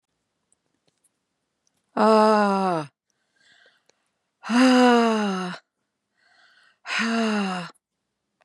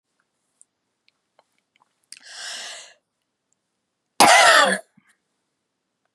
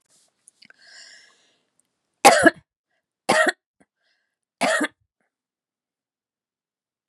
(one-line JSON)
{"exhalation_length": "8.4 s", "exhalation_amplitude": 18900, "exhalation_signal_mean_std_ratio": 0.43, "cough_length": "6.1 s", "cough_amplitude": 32746, "cough_signal_mean_std_ratio": 0.26, "three_cough_length": "7.1 s", "three_cough_amplitude": 32623, "three_cough_signal_mean_std_ratio": 0.23, "survey_phase": "beta (2021-08-13 to 2022-03-07)", "age": "65+", "gender": "Female", "wearing_mask": "No", "symptom_none": true, "smoker_status": "Ex-smoker", "respiratory_condition_asthma": false, "respiratory_condition_other": false, "recruitment_source": "REACT", "submission_delay": "1 day", "covid_test_result": "Negative", "covid_test_method": "RT-qPCR", "influenza_a_test_result": "Negative", "influenza_b_test_result": "Negative"}